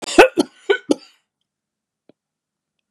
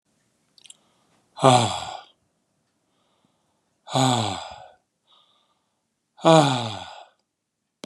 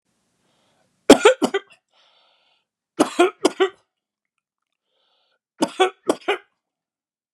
{
  "cough_length": "2.9 s",
  "cough_amplitude": 32768,
  "cough_signal_mean_std_ratio": 0.24,
  "exhalation_length": "7.9 s",
  "exhalation_amplitude": 29836,
  "exhalation_signal_mean_std_ratio": 0.3,
  "three_cough_length": "7.3 s",
  "three_cough_amplitude": 32768,
  "three_cough_signal_mean_std_ratio": 0.25,
  "survey_phase": "beta (2021-08-13 to 2022-03-07)",
  "age": "45-64",
  "gender": "Male",
  "wearing_mask": "No",
  "symptom_none": true,
  "smoker_status": "Never smoked",
  "respiratory_condition_asthma": true,
  "respiratory_condition_other": false,
  "recruitment_source": "REACT",
  "submission_delay": "3 days",
  "covid_test_result": "Negative",
  "covid_test_method": "RT-qPCR",
  "influenza_a_test_result": "Negative",
  "influenza_b_test_result": "Negative"
}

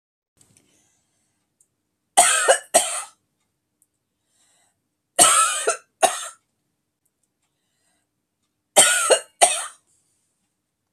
{
  "three_cough_length": "10.9 s",
  "three_cough_amplitude": 32768,
  "three_cough_signal_mean_std_ratio": 0.31,
  "survey_phase": "beta (2021-08-13 to 2022-03-07)",
  "age": "65+",
  "gender": "Female",
  "wearing_mask": "No",
  "symptom_none": true,
  "smoker_status": "Never smoked",
  "respiratory_condition_asthma": false,
  "respiratory_condition_other": false,
  "recruitment_source": "REACT",
  "submission_delay": "12 days",
  "covid_test_result": "Negative",
  "covid_test_method": "RT-qPCR"
}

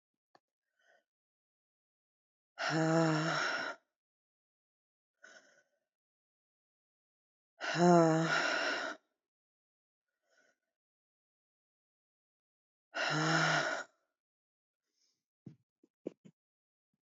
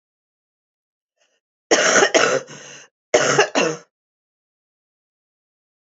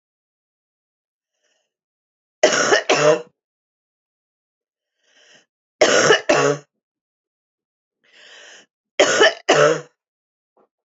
{
  "exhalation_length": "17.1 s",
  "exhalation_amplitude": 6025,
  "exhalation_signal_mean_std_ratio": 0.34,
  "cough_length": "5.8 s",
  "cough_amplitude": 30950,
  "cough_signal_mean_std_ratio": 0.36,
  "three_cough_length": "10.9 s",
  "three_cough_amplitude": 29952,
  "three_cough_signal_mean_std_ratio": 0.34,
  "survey_phase": "beta (2021-08-13 to 2022-03-07)",
  "age": "45-64",
  "gender": "Female",
  "wearing_mask": "No",
  "symptom_cough_any": true,
  "symptom_runny_or_blocked_nose": true,
  "symptom_shortness_of_breath": true,
  "symptom_sore_throat": true,
  "symptom_abdominal_pain": true,
  "symptom_diarrhoea": true,
  "symptom_fatigue": true,
  "symptom_fever_high_temperature": true,
  "symptom_headache": true,
  "symptom_change_to_sense_of_smell_or_taste": true,
  "symptom_loss_of_taste": true,
  "symptom_onset": "8 days",
  "smoker_status": "Current smoker (1 to 10 cigarettes per day)",
  "respiratory_condition_asthma": false,
  "respiratory_condition_other": false,
  "recruitment_source": "Test and Trace",
  "submission_delay": "2 days",
  "covid_test_result": "Positive",
  "covid_test_method": "RT-qPCR",
  "covid_ct_value": 18.5,
  "covid_ct_gene": "N gene",
  "covid_ct_mean": 18.5,
  "covid_viral_load": "830000 copies/ml",
  "covid_viral_load_category": "Low viral load (10K-1M copies/ml)"
}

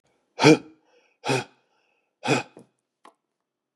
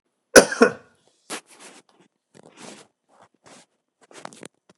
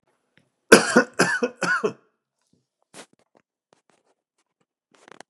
{
  "exhalation_length": "3.8 s",
  "exhalation_amplitude": 27861,
  "exhalation_signal_mean_std_ratio": 0.25,
  "cough_length": "4.8 s",
  "cough_amplitude": 32768,
  "cough_signal_mean_std_ratio": 0.17,
  "three_cough_length": "5.3 s",
  "three_cough_amplitude": 32768,
  "three_cough_signal_mean_std_ratio": 0.25,
  "survey_phase": "beta (2021-08-13 to 2022-03-07)",
  "age": "45-64",
  "gender": "Male",
  "wearing_mask": "No",
  "symptom_cough_any": true,
  "symptom_runny_or_blocked_nose": true,
  "symptom_sore_throat": true,
  "symptom_fatigue": true,
  "symptom_headache": true,
  "symptom_onset": "4 days",
  "smoker_status": "Never smoked",
  "respiratory_condition_asthma": false,
  "respiratory_condition_other": false,
  "recruitment_source": "Test and Trace",
  "submission_delay": "2 days",
  "covid_test_result": "Positive",
  "covid_test_method": "RT-qPCR",
  "covid_ct_value": 21.2,
  "covid_ct_gene": "N gene"
}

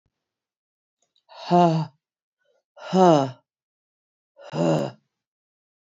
{
  "exhalation_length": "5.8 s",
  "exhalation_amplitude": 21869,
  "exhalation_signal_mean_std_ratio": 0.32,
  "survey_phase": "beta (2021-08-13 to 2022-03-07)",
  "age": "45-64",
  "gender": "Female",
  "wearing_mask": "No",
  "symptom_cough_any": true,
  "symptom_runny_or_blocked_nose": true,
  "symptom_fatigue": true,
  "symptom_headache": true,
  "symptom_onset": "4 days",
  "smoker_status": "Never smoked",
  "respiratory_condition_asthma": false,
  "respiratory_condition_other": false,
  "recruitment_source": "Test and Trace",
  "submission_delay": "1 day",
  "covid_test_result": "Positive",
  "covid_test_method": "ePCR"
}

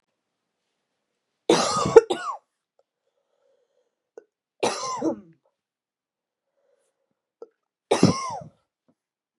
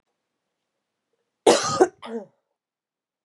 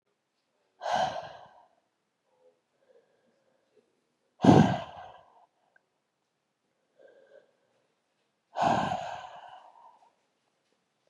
{
  "three_cough_length": "9.4 s",
  "three_cough_amplitude": 32768,
  "three_cough_signal_mean_std_ratio": 0.24,
  "cough_length": "3.2 s",
  "cough_amplitude": 26914,
  "cough_signal_mean_std_ratio": 0.26,
  "exhalation_length": "11.1 s",
  "exhalation_amplitude": 16390,
  "exhalation_signal_mean_std_ratio": 0.24,
  "survey_phase": "beta (2021-08-13 to 2022-03-07)",
  "age": "18-44",
  "gender": "Female",
  "wearing_mask": "No",
  "symptom_cough_any": true,
  "symptom_runny_or_blocked_nose": true,
  "symptom_shortness_of_breath": true,
  "symptom_fatigue": true,
  "symptom_fever_high_temperature": true,
  "symptom_headache": true,
  "symptom_change_to_sense_of_smell_or_taste": true,
  "symptom_onset": "2 days",
  "smoker_status": "Never smoked",
  "respiratory_condition_asthma": false,
  "respiratory_condition_other": false,
  "recruitment_source": "Test and Trace",
  "submission_delay": "1 day",
  "covid_test_result": "Positive",
  "covid_test_method": "RT-qPCR"
}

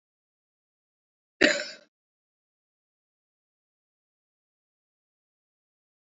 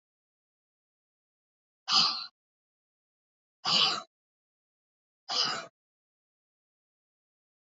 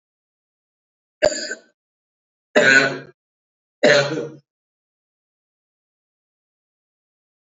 {
  "cough_length": "6.1 s",
  "cough_amplitude": 18136,
  "cough_signal_mean_std_ratio": 0.13,
  "exhalation_length": "7.8 s",
  "exhalation_amplitude": 8989,
  "exhalation_signal_mean_std_ratio": 0.27,
  "three_cough_length": "7.5 s",
  "three_cough_amplitude": 28562,
  "three_cough_signal_mean_std_ratio": 0.27,
  "survey_phase": "alpha (2021-03-01 to 2021-08-12)",
  "age": "65+",
  "gender": "Female",
  "wearing_mask": "No",
  "symptom_none": true,
  "smoker_status": "Ex-smoker",
  "respiratory_condition_asthma": false,
  "respiratory_condition_other": true,
  "recruitment_source": "REACT",
  "submission_delay": "2 days",
  "covid_test_result": "Negative",
  "covid_test_method": "RT-qPCR"
}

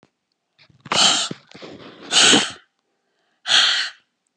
{
  "exhalation_length": "4.4 s",
  "exhalation_amplitude": 28995,
  "exhalation_signal_mean_std_ratio": 0.43,
  "survey_phase": "beta (2021-08-13 to 2022-03-07)",
  "age": "65+",
  "gender": "Female",
  "wearing_mask": "No",
  "symptom_none": true,
  "smoker_status": "Ex-smoker",
  "respiratory_condition_asthma": false,
  "respiratory_condition_other": false,
  "recruitment_source": "REACT",
  "submission_delay": "3 days",
  "covid_test_result": "Negative",
  "covid_test_method": "RT-qPCR",
  "influenza_a_test_result": "Negative",
  "influenza_b_test_result": "Negative"
}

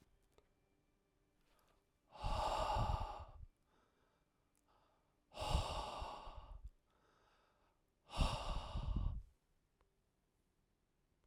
{
  "exhalation_length": "11.3 s",
  "exhalation_amplitude": 2368,
  "exhalation_signal_mean_std_ratio": 0.43,
  "survey_phase": "alpha (2021-03-01 to 2021-08-12)",
  "age": "18-44",
  "gender": "Male",
  "wearing_mask": "No",
  "symptom_none": true,
  "smoker_status": "Ex-smoker",
  "respiratory_condition_asthma": false,
  "respiratory_condition_other": false,
  "recruitment_source": "REACT",
  "submission_delay": "1 day",
  "covid_test_result": "Negative",
  "covid_test_method": "RT-qPCR"
}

